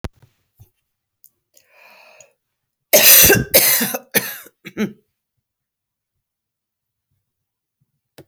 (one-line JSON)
{"cough_length": "8.3 s", "cough_amplitude": 32768, "cough_signal_mean_std_ratio": 0.28, "survey_phase": "beta (2021-08-13 to 2022-03-07)", "age": "45-64", "gender": "Female", "wearing_mask": "No", "symptom_cough_any": true, "symptom_runny_or_blocked_nose": true, "symptom_sore_throat": true, "symptom_diarrhoea": true, "symptom_fatigue": true, "symptom_headache": true, "symptom_change_to_sense_of_smell_or_taste": true, "smoker_status": "Ex-smoker", "respiratory_condition_asthma": false, "respiratory_condition_other": false, "recruitment_source": "Test and Trace", "submission_delay": "0 days", "covid_test_result": "Positive", "covid_test_method": "LFT"}